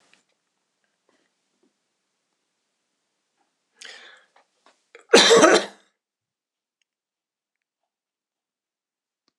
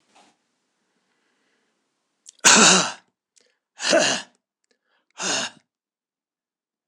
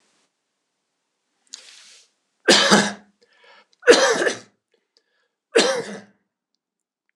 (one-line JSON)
{"cough_length": "9.4 s", "cough_amplitude": 26028, "cough_signal_mean_std_ratio": 0.19, "exhalation_length": "6.9 s", "exhalation_amplitude": 26028, "exhalation_signal_mean_std_ratio": 0.29, "three_cough_length": "7.2 s", "three_cough_amplitude": 26028, "three_cough_signal_mean_std_ratio": 0.31, "survey_phase": "beta (2021-08-13 to 2022-03-07)", "age": "65+", "gender": "Male", "wearing_mask": "No", "symptom_none": true, "smoker_status": "Ex-smoker", "respiratory_condition_asthma": false, "respiratory_condition_other": false, "recruitment_source": "REACT", "submission_delay": "4 days", "covid_test_result": "Negative", "covid_test_method": "RT-qPCR"}